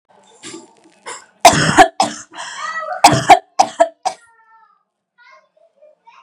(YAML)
three_cough_length: 6.2 s
three_cough_amplitude: 32768
three_cough_signal_mean_std_ratio: 0.34
survey_phase: beta (2021-08-13 to 2022-03-07)
age: 18-44
gender: Female
wearing_mask: 'No'
symptom_none: true
smoker_status: Never smoked
respiratory_condition_asthma: false
respiratory_condition_other: false
recruitment_source: REACT
submission_delay: 3 days
covid_test_result: Negative
covid_test_method: RT-qPCR
influenza_a_test_result: Negative
influenza_b_test_result: Negative